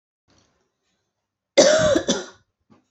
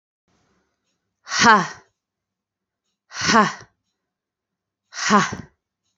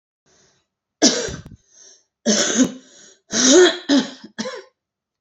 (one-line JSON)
{"cough_length": "2.9 s", "cough_amplitude": 28245, "cough_signal_mean_std_ratio": 0.36, "exhalation_length": "6.0 s", "exhalation_amplitude": 31684, "exhalation_signal_mean_std_ratio": 0.31, "three_cough_length": "5.2 s", "three_cough_amplitude": 29123, "three_cough_signal_mean_std_ratio": 0.42, "survey_phase": "beta (2021-08-13 to 2022-03-07)", "age": "18-44", "gender": "Female", "wearing_mask": "No", "symptom_cough_any": true, "symptom_runny_or_blocked_nose": true, "symptom_shortness_of_breath": true, "symptom_sore_throat": true, "symptom_abdominal_pain": true, "symptom_diarrhoea": true, "symptom_fatigue": true, "symptom_headache": true, "symptom_onset": "3 days", "smoker_status": "Ex-smoker", "respiratory_condition_asthma": false, "respiratory_condition_other": false, "recruitment_source": "Test and Trace", "submission_delay": "1 day", "covid_test_result": "Positive", "covid_test_method": "RT-qPCR", "covid_ct_value": 16.4, "covid_ct_gene": "ORF1ab gene", "covid_ct_mean": 16.7, "covid_viral_load": "3300000 copies/ml", "covid_viral_load_category": "High viral load (>1M copies/ml)"}